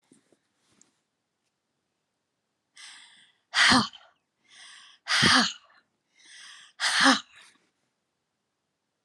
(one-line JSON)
{"exhalation_length": "9.0 s", "exhalation_amplitude": 14940, "exhalation_signal_mean_std_ratio": 0.29, "survey_phase": "alpha (2021-03-01 to 2021-08-12)", "age": "45-64", "gender": "Female", "wearing_mask": "No", "symptom_none": true, "smoker_status": "Never smoked", "respiratory_condition_asthma": true, "respiratory_condition_other": false, "recruitment_source": "REACT", "submission_delay": "2 days", "covid_test_result": "Negative", "covid_test_method": "RT-qPCR"}